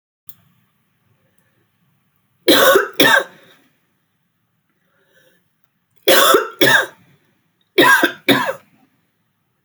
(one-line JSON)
{"three_cough_length": "9.6 s", "three_cough_amplitude": 32768, "three_cough_signal_mean_std_ratio": 0.36, "survey_phase": "beta (2021-08-13 to 2022-03-07)", "age": "45-64", "gender": "Female", "wearing_mask": "No", "symptom_cough_any": true, "symptom_new_continuous_cough": true, "symptom_runny_or_blocked_nose": true, "symptom_sore_throat": true, "symptom_fatigue": true, "smoker_status": "Never smoked", "respiratory_condition_asthma": false, "respiratory_condition_other": false, "recruitment_source": "Test and Trace", "submission_delay": "1 day", "covid_test_result": "Positive", "covid_test_method": "RT-qPCR", "covid_ct_value": 27.8, "covid_ct_gene": "N gene"}